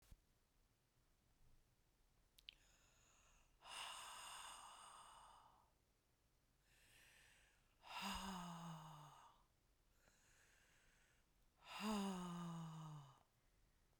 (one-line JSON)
{"exhalation_length": "14.0 s", "exhalation_amplitude": 587, "exhalation_signal_mean_std_ratio": 0.5, "survey_phase": "beta (2021-08-13 to 2022-03-07)", "age": "45-64", "gender": "Female", "wearing_mask": "No", "symptom_cough_any": true, "symptom_new_continuous_cough": true, "symptom_sore_throat": true, "symptom_fatigue": true, "symptom_fever_high_temperature": true, "symptom_headache": true, "symptom_change_to_sense_of_smell_or_taste": true, "symptom_other": true, "symptom_onset": "5 days", "smoker_status": "Never smoked", "respiratory_condition_asthma": true, "respiratory_condition_other": false, "recruitment_source": "Test and Trace", "submission_delay": "2 days", "covid_test_result": "Positive", "covid_test_method": "ePCR"}